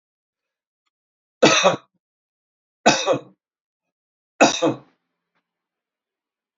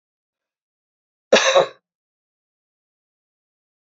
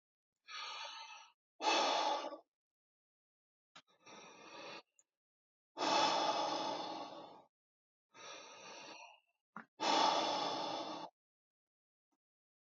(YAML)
three_cough_length: 6.6 s
three_cough_amplitude: 28994
three_cough_signal_mean_std_ratio: 0.28
cough_length: 3.9 s
cough_amplitude: 28764
cough_signal_mean_std_ratio: 0.22
exhalation_length: 12.8 s
exhalation_amplitude: 2947
exhalation_signal_mean_std_ratio: 0.46
survey_phase: beta (2021-08-13 to 2022-03-07)
age: 45-64
gender: Male
wearing_mask: 'No'
symptom_cough_any: true
symptom_runny_or_blocked_nose: true
smoker_status: Never smoked
respiratory_condition_asthma: false
respiratory_condition_other: false
recruitment_source: REACT
submission_delay: 1 day
covid_test_result: Negative
covid_test_method: RT-qPCR
influenza_a_test_result: Negative
influenza_b_test_result: Negative